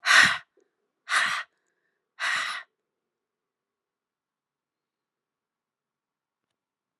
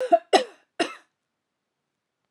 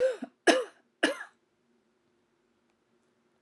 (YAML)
exhalation_length: 7.0 s
exhalation_amplitude: 19386
exhalation_signal_mean_std_ratio: 0.26
cough_length: 2.3 s
cough_amplitude: 19063
cough_signal_mean_std_ratio: 0.27
three_cough_length: 3.4 s
three_cough_amplitude: 14330
three_cough_signal_mean_std_ratio: 0.28
survey_phase: alpha (2021-03-01 to 2021-08-12)
age: 18-44
gender: Female
wearing_mask: 'No'
symptom_cough_any: true
symptom_fatigue: true
symptom_onset: 2 days
smoker_status: Never smoked
respiratory_condition_asthma: false
respiratory_condition_other: false
recruitment_source: Test and Trace
submission_delay: 2 days
covid_test_result: Positive
covid_test_method: RT-qPCR
covid_ct_value: 18.6
covid_ct_gene: ORF1ab gene
covid_ct_mean: 18.8
covid_viral_load: 700000 copies/ml
covid_viral_load_category: Low viral load (10K-1M copies/ml)